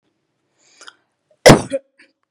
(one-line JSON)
{"cough_length": "2.3 s", "cough_amplitude": 32768, "cough_signal_mean_std_ratio": 0.22, "survey_phase": "beta (2021-08-13 to 2022-03-07)", "age": "18-44", "gender": "Female", "wearing_mask": "No", "symptom_none": true, "smoker_status": "Never smoked", "respiratory_condition_asthma": false, "respiratory_condition_other": false, "recruitment_source": "REACT", "submission_delay": "2 days", "covid_test_result": "Negative", "covid_test_method": "RT-qPCR", "influenza_a_test_result": "Negative", "influenza_b_test_result": "Negative"}